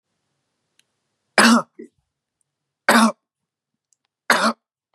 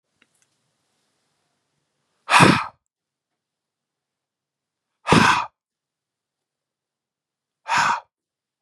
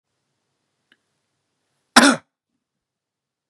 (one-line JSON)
{"three_cough_length": "4.9 s", "three_cough_amplitude": 32017, "three_cough_signal_mean_std_ratio": 0.29, "exhalation_length": "8.6 s", "exhalation_amplitude": 32757, "exhalation_signal_mean_std_ratio": 0.25, "cough_length": "3.5 s", "cough_amplitude": 32768, "cough_signal_mean_std_ratio": 0.17, "survey_phase": "beta (2021-08-13 to 2022-03-07)", "age": "18-44", "gender": "Male", "wearing_mask": "No", "symptom_none": true, "smoker_status": "Ex-smoker", "respiratory_condition_asthma": false, "respiratory_condition_other": false, "recruitment_source": "Test and Trace", "submission_delay": "2 days", "covid_test_result": "Positive", "covid_test_method": "RT-qPCR", "covid_ct_value": 33.9, "covid_ct_gene": "ORF1ab gene"}